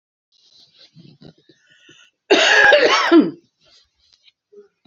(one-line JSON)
{"cough_length": "4.9 s", "cough_amplitude": 28130, "cough_signal_mean_std_ratio": 0.38, "survey_phase": "beta (2021-08-13 to 2022-03-07)", "age": "45-64", "gender": "Female", "wearing_mask": "No", "symptom_none": true, "smoker_status": "Never smoked", "respiratory_condition_asthma": false, "respiratory_condition_other": false, "recruitment_source": "REACT", "submission_delay": "1 day", "covid_test_result": "Negative", "covid_test_method": "RT-qPCR", "influenza_a_test_result": "Unknown/Void", "influenza_b_test_result": "Unknown/Void"}